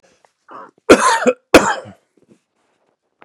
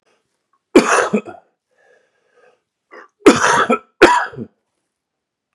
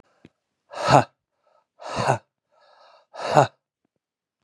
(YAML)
cough_length: 3.2 s
cough_amplitude: 32768
cough_signal_mean_std_ratio: 0.32
three_cough_length: 5.5 s
three_cough_amplitude: 32768
three_cough_signal_mean_std_ratio: 0.34
exhalation_length: 4.4 s
exhalation_amplitude: 31636
exhalation_signal_mean_std_ratio: 0.28
survey_phase: beta (2021-08-13 to 2022-03-07)
age: 45-64
gender: Male
wearing_mask: 'Yes'
symptom_none: true
symptom_onset: 8 days
smoker_status: Current smoker (11 or more cigarettes per day)
respiratory_condition_asthma: false
respiratory_condition_other: false
recruitment_source: REACT
submission_delay: 1 day
covid_test_result: Positive
covid_test_method: RT-qPCR
covid_ct_value: 26.0
covid_ct_gene: N gene
influenza_a_test_result: Negative
influenza_b_test_result: Negative